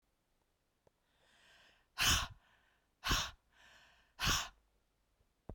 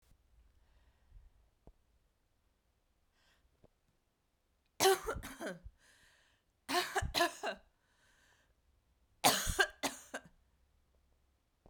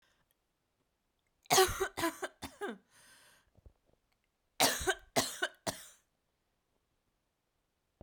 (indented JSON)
{
  "exhalation_length": "5.5 s",
  "exhalation_amplitude": 3655,
  "exhalation_signal_mean_std_ratio": 0.31,
  "three_cough_length": "11.7 s",
  "three_cough_amplitude": 7838,
  "three_cough_signal_mean_std_ratio": 0.28,
  "cough_length": "8.0 s",
  "cough_amplitude": 8485,
  "cough_signal_mean_std_ratio": 0.29,
  "survey_phase": "beta (2021-08-13 to 2022-03-07)",
  "age": "45-64",
  "gender": "Female",
  "wearing_mask": "No",
  "symptom_none": true,
  "smoker_status": "Ex-smoker",
  "respiratory_condition_asthma": false,
  "respiratory_condition_other": false,
  "recruitment_source": "REACT",
  "submission_delay": "2 days",
  "covid_test_result": "Negative",
  "covid_test_method": "RT-qPCR"
}